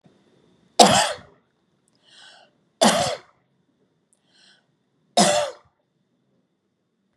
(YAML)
three_cough_length: 7.2 s
three_cough_amplitude: 32768
three_cough_signal_mean_std_ratio: 0.28
survey_phase: beta (2021-08-13 to 2022-03-07)
age: 65+
gender: Female
wearing_mask: 'No'
symptom_cough_any: true
symptom_abdominal_pain: true
symptom_onset: 9 days
smoker_status: Ex-smoker
respiratory_condition_asthma: false
respiratory_condition_other: false
recruitment_source: REACT
submission_delay: 1 day
covid_test_result: Negative
covid_test_method: RT-qPCR